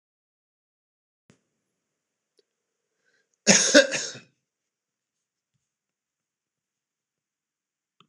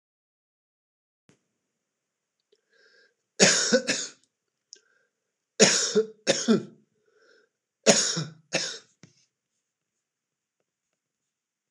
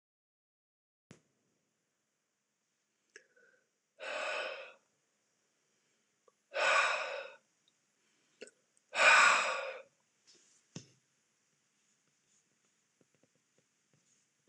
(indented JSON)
{
  "cough_length": "8.1 s",
  "cough_amplitude": 25936,
  "cough_signal_mean_std_ratio": 0.17,
  "three_cough_length": "11.7 s",
  "three_cough_amplitude": 26028,
  "three_cough_signal_mean_std_ratio": 0.29,
  "exhalation_length": "14.5 s",
  "exhalation_amplitude": 8991,
  "exhalation_signal_mean_std_ratio": 0.26,
  "survey_phase": "beta (2021-08-13 to 2022-03-07)",
  "age": "65+",
  "gender": "Male",
  "wearing_mask": "No",
  "symptom_none": true,
  "smoker_status": "Ex-smoker",
  "respiratory_condition_asthma": false,
  "respiratory_condition_other": false,
  "recruitment_source": "REACT",
  "submission_delay": "2 days",
  "covid_test_result": "Negative",
  "covid_test_method": "RT-qPCR",
  "influenza_a_test_result": "Unknown/Void",
  "influenza_b_test_result": "Unknown/Void"
}